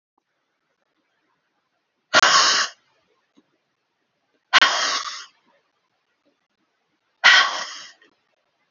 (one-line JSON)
{"exhalation_length": "8.7 s", "exhalation_amplitude": 30842, "exhalation_signal_mean_std_ratio": 0.3, "survey_phase": "alpha (2021-03-01 to 2021-08-12)", "age": "45-64", "gender": "Female", "wearing_mask": "No", "symptom_none": true, "smoker_status": "Never smoked", "respiratory_condition_asthma": false, "respiratory_condition_other": false, "recruitment_source": "REACT", "submission_delay": "1 day", "covid_test_result": "Negative", "covid_test_method": "RT-qPCR"}